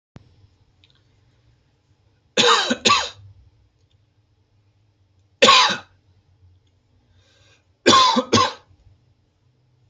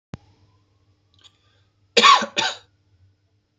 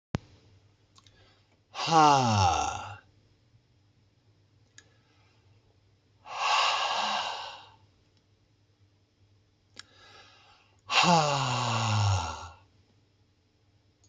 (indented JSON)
{
  "three_cough_length": "9.9 s",
  "three_cough_amplitude": 32573,
  "three_cough_signal_mean_std_ratio": 0.31,
  "cough_length": "3.6 s",
  "cough_amplitude": 29113,
  "cough_signal_mean_std_ratio": 0.26,
  "exhalation_length": "14.1 s",
  "exhalation_amplitude": 13671,
  "exhalation_signal_mean_std_ratio": 0.41,
  "survey_phase": "beta (2021-08-13 to 2022-03-07)",
  "age": "18-44",
  "gender": "Male",
  "wearing_mask": "No",
  "symptom_none": true,
  "smoker_status": "Ex-smoker",
  "respiratory_condition_asthma": false,
  "respiratory_condition_other": false,
  "recruitment_source": "REACT",
  "submission_delay": "1 day",
  "covid_test_result": "Negative",
  "covid_test_method": "RT-qPCR",
  "influenza_a_test_result": "Unknown/Void",
  "influenza_b_test_result": "Unknown/Void"
}